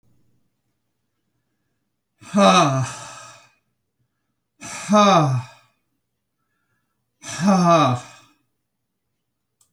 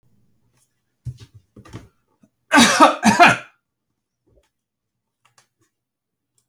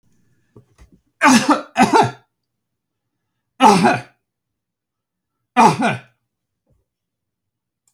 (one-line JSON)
{"exhalation_length": "9.7 s", "exhalation_amplitude": 27485, "exhalation_signal_mean_std_ratio": 0.36, "cough_length": "6.5 s", "cough_amplitude": 32767, "cough_signal_mean_std_ratio": 0.27, "three_cough_length": "7.9 s", "three_cough_amplitude": 31636, "three_cough_signal_mean_std_ratio": 0.33, "survey_phase": "beta (2021-08-13 to 2022-03-07)", "age": "65+", "gender": "Male", "wearing_mask": "No", "symptom_none": true, "smoker_status": "Never smoked", "respiratory_condition_asthma": false, "respiratory_condition_other": false, "recruitment_source": "REACT", "submission_delay": "1 day", "covid_test_result": "Negative", "covid_test_method": "RT-qPCR"}